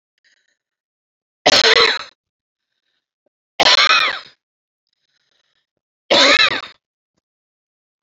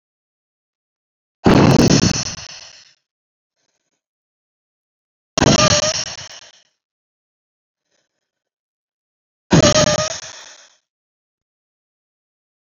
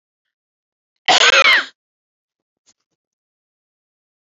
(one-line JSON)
{"three_cough_length": "8.0 s", "three_cough_amplitude": 32767, "three_cough_signal_mean_std_ratio": 0.34, "exhalation_length": "12.8 s", "exhalation_amplitude": 32767, "exhalation_signal_mean_std_ratio": 0.31, "cough_length": "4.4 s", "cough_amplitude": 31880, "cough_signal_mean_std_ratio": 0.28, "survey_phase": "beta (2021-08-13 to 2022-03-07)", "age": "18-44", "gender": "Female", "wearing_mask": "No", "symptom_cough_any": true, "symptom_shortness_of_breath": true, "symptom_diarrhoea": true, "symptom_fatigue": true, "symptom_headache": true, "symptom_onset": "2 days", "smoker_status": "Ex-smoker", "respiratory_condition_asthma": false, "respiratory_condition_other": false, "recruitment_source": "Test and Trace", "submission_delay": "1 day", "covid_test_result": "Positive", "covid_test_method": "ePCR"}